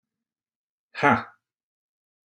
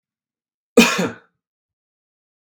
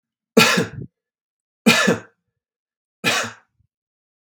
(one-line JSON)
{"exhalation_length": "2.3 s", "exhalation_amplitude": 22756, "exhalation_signal_mean_std_ratio": 0.22, "cough_length": "2.5 s", "cough_amplitude": 32768, "cough_signal_mean_std_ratio": 0.24, "three_cough_length": "4.3 s", "three_cough_amplitude": 32768, "three_cough_signal_mean_std_ratio": 0.34, "survey_phase": "beta (2021-08-13 to 2022-03-07)", "age": "45-64", "gender": "Male", "wearing_mask": "No", "symptom_none": true, "smoker_status": "Ex-smoker", "respiratory_condition_asthma": false, "respiratory_condition_other": false, "recruitment_source": "Test and Trace", "submission_delay": "1 day", "covid_test_result": "Negative", "covid_test_method": "RT-qPCR"}